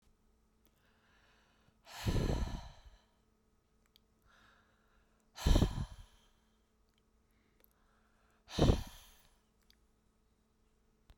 {"exhalation_length": "11.2 s", "exhalation_amplitude": 7148, "exhalation_signal_mean_std_ratio": 0.26, "survey_phase": "beta (2021-08-13 to 2022-03-07)", "age": "65+", "gender": "Female", "wearing_mask": "No", "symptom_none": true, "smoker_status": "Never smoked", "respiratory_condition_asthma": false, "respiratory_condition_other": false, "recruitment_source": "REACT", "submission_delay": "1 day", "covid_test_result": "Negative", "covid_test_method": "RT-qPCR"}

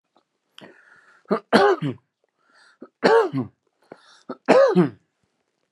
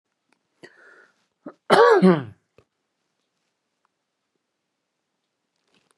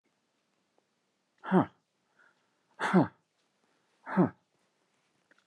{"three_cough_length": "5.7 s", "three_cough_amplitude": 30529, "three_cough_signal_mean_std_ratio": 0.36, "cough_length": "6.0 s", "cough_amplitude": 32670, "cough_signal_mean_std_ratio": 0.23, "exhalation_length": "5.5 s", "exhalation_amplitude": 10837, "exhalation_signal_mean_std_ratio": 0.24, "survey_phase": "beta (2021-08-13 to 2022-03-07)", "age": "45-64", "gender": "Male", "wearing_mask": "No", "symptom_none": true, "smoker_status": "Never smoked", "respiratory_condition_asthma": false, "respiratory_condition_other": false, "recruitment_source": "REACT", "submission_delay": "3 days", "covid_test_result": "Negative", "covid_test_method": "RT-qPCR"}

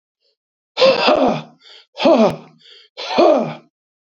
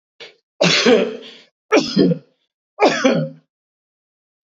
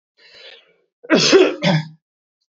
{"exhalation_length": "4.1 s", "exhalation_amplitude": 27913, "exhalation_signal_mean_std_ratio": 0.49, "three_cough_length": "4.4 s", "three_cough_amplitude": 28656, "three_cough_signal_mean_std_ratio": 0.46, "cough_length": "2.6 s", "cough_amplitude": 28022, "cough_signal_mean_std_ratio": 0.42, "survey_phase": "beta (2021-08-13 to 2022-03-07)", "age": "65+", "gender": "Male", "wearing_mask": "No", "symptom_cough_any": true, "symptom_runny_or_blocked_nose": true, "smoker_status": "Never smoked", "respiratory_condition_asthma": false, "respiratory_condition_other": false, "recruitment_source": "Test and Trace", "submission_delay": "1 day", "covid_test_result": "Positive", "covid_test_method": "LFT"}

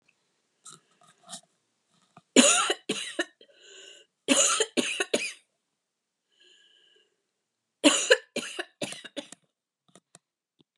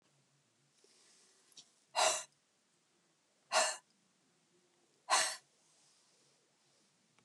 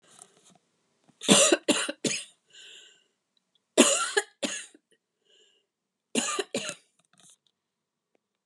{"three_cough_length": "10.8 s", "three_cough_amplitude": 27781, "three_cough_signal_mean_std_ratio": 0.3, "exhalation_length": "7.2 s", "exhalation_amplitude": 4546, "exhalation_signal_mean_std_ratio": 0.26, "cough_length": "8.5 s", "cough_amplitude": 26828, "cough_signal_mean_std_ratio": 0.31, "survey_phase": "alpha (2021-03-01 to 2021-08-12)", "age": "65+", "gender": "Female", "wearing_mask": "No", "symptom_none": true, "smoker_status": "Never smoked", "respiratory_condition_asthma": false, "respiratory_condition_other": false, "recruitment_source": "REACT", "submission_delay": "3 days", "covid_test_result": "Negative", "covid_test_method": "RT-qPCR"}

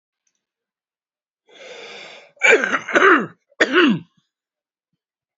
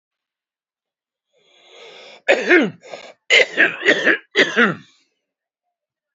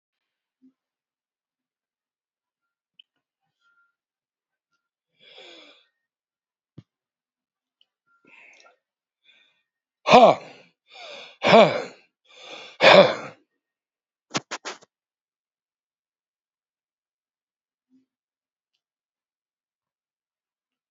{"cough_length": "5.4 s", "cough_amplitude": 28111, "cough_signal_mean_std_ratio": 0.35, "three_cough_length": "6.1 s", "three_cough_amplitude": 30404, "three_cough_signal_mean_std_ratio": 0.37, "exhalation_length": "20.9 s", "exhalation_amplitude": 32767, "exhalation_signal_mean_std_ratio": 0.17, "survey_phase": "beta (2021-08-13 to 2022-03-07)", "age": "65+", "gender": "Male", "wearing_mask": "No", "symptom_none": true, "smoker_status": "Current smoker (11 or more cigarettes per day)", "respiratory_condition_asthma": false, "respiratory_condition_other": false, "recruitment_source": "REACT", "submission_delay": "2 days", "covid_test_result": "Negative", "covid_test_method": "RT-qPCR"}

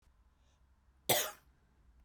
{"cough_length": "2.0 s", "cough_amplitude": 7572, "cough_signal_mean_std_ratio": 0.27, "survey_phase": "beta (2021-08-13 to 2022-03-07)", "age": "45-64", "gender": "Female", "wearing_mask": "No", "symptom_none": true, "smoker_status": "Ex-smoker", "respiratory_condition_asthma": false, "respiratory_condition_other": true, "recruitment_source": "REACT", "submission_delay": "1 day", "covid_test_result": "Negative", "covid_test_method": "RT-qPCR"}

